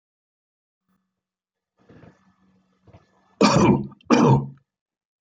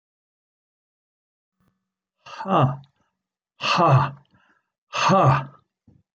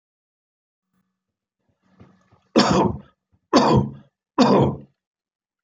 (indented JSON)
{
  "cough_length": "5.2 s",
  "cough_amplitude": 23388,
  "cough_signal_mean_std_ratio": 0.32,
  "exhalation_length": "6.1 s",
  "exhalation_amplitude": 17693,
  "exhalation_signal_mean_std_ratio": 0.37,
  "three_cough_length": "5.6 s",
  "three_cough_amplitude": 25558,
  "three_cough_signal_mean_std_ratio": 0.36,
  "survey_phase": "beta (2021-08-13 to 2022-03-07)",
  "age": "65+",
  "gender": "Male",
  "wearing_mask": "No",
  "symptom_none": true,
  "smoker_status": "Never smoked",
  "respiratory_condition_asthma": false,
  "respiratory_condition_other": false,
  "recruitment_source": "REACT",
  "submission_delay": "2 days",
  "covid_test_result": "Negative",
  "covid_test_method": "RT-qPCR"
}